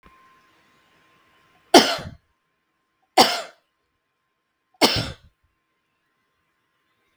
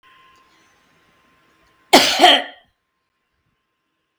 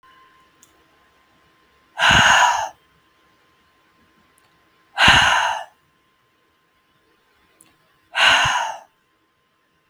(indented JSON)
{
  "three_cough_length": "7.2 s",
  "three_cough_amplitude": 32768,
  "three_cough_signal_mean_std_ratio": 0.21,
  "cough_length": "4.2 s",
  "cough_amplitude": 32768,
  "cough_signal_mean_std_ratio": 0.26,
  "exhalation_length": "9.9 s",
  "exhalation_amplitude": 32768,
  "exhalation_signal_mean_std_ratio": 0.35,
  "survey_phase": "beta (2021-08-13 to 2022-03-07)",
  "age": "45-64",
  "gender": "Female",
  "wearing_mask": "No",
  "symptom_none": true,
  "smoker_status": "Never smoked",
  "respiratory_condition_asthma": false,
  "respiratory_condition_other": false,
  "recruitment_source": "REACT",
  "submission_delay": "3 days",
  "covid_test_result": "Negative",
  "covid_test_method": "RT-qPCR",
  "influenza_a_test_result": "Negative",
  "influenza_b_test_result": "Negative"
}